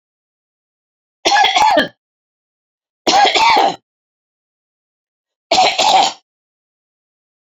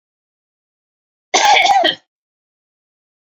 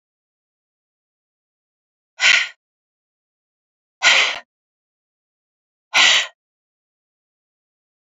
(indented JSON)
{
  "three_cough_length": "7.6 s",
  "three_cough_amplitude": 32767,
  "three_cough_signal_mean_std_ratio": 0.42,
  "cough_length": "3.3 s",
  "cough_amplitude": 29814,
  "cough_signal_mean_std_ratio": 0.36,
  "exhalation_length": "8.0 s",
  "exhalation_amplitude": 30767,
  "exhalation_signal_mean_std_ratio": 0.26,
  "survey_phase": "beta (2021-08-13 to 2022-03-07)",
  "age": "65+",
  "gender": "Female",
  "wearing_mask": "No",
  "symptom_cough_any": true,
  "smoker_status": "Ex-smoker",
  "respiratory_condition_asthma": true,
  "respiratory_condition_other": false,
  "recruitment_source": "REACT",
  "submission_delay": "1 day",
  "covid_test_result": "Negative",
  "covid_test_method": "RT-qPCR"
}